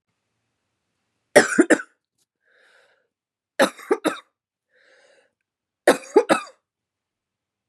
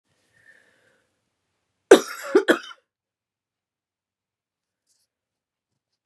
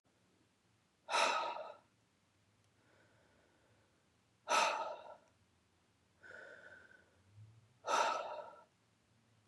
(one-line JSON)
{"three_cough_length": "7.7 s", "three_cough_amplitude": 32768, "three_cough_signal_mean_std_ratio": 0.23, "cough_length": "6.1 s", "cough_amplitude": 32768, "cough_signal_mean_std_ratio": 0.16, "exhalation_length": "9.5 s", "exhalation_amplitude": 3432, "exhalation_signal_mean_std_ratio": 0.35, "survey_phase": "beta (2021-08-13 to 2022-03-07)", "age": "45-64", "gender": "Female", "wearing_mask": "Yes", "symptom_cough_any": true, "symptom_runny_or_blocked_nose": true, "symptom_sore_throat": true, "symptom_fatigue": true, "symptom_headache": true, "symptom_change_to_sense_of_smell_or_taste": true, "symptom_loss_of_taste": true, "smoker_status": "Never smoked", "respiratory_condition_asthma": true, "respiratory_condition_other": false, "recruitment_source": "Test and Trace", "submission_delay": "2 days", "covid_test_result": "Positive", "covid_test_method": "RT-qPCR", "covid_ct_value": 20.6, "covid_ct_gene": "ORF1ab gene", "covid_ct_mean": 20.8, "covid_viral_load": "150000 copies/ml", "covid_viral_load_category": "Low viral load (10K-1M copies/ml)"}